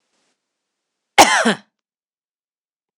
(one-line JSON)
{"cough_length": "3.0 s", "cough_amplitude": 26028, "cough_signal_mean_std_ratio": 0.25, "survey_phase": "alpha (2021-03-01 to 2021-08-12)", "age": "45-64", "gender": "Female", "wearing_mask": "No", "symptom_none": true, "smoker_status": "Ex-smoker", "respiratory_condition_asthma": false, "respiratory_condition_other": false, "recruitment_source": "REACT", "submission_delay": "2 days", "covid_test_result": "Negative", "covid_test_method": "RT-qPCR"}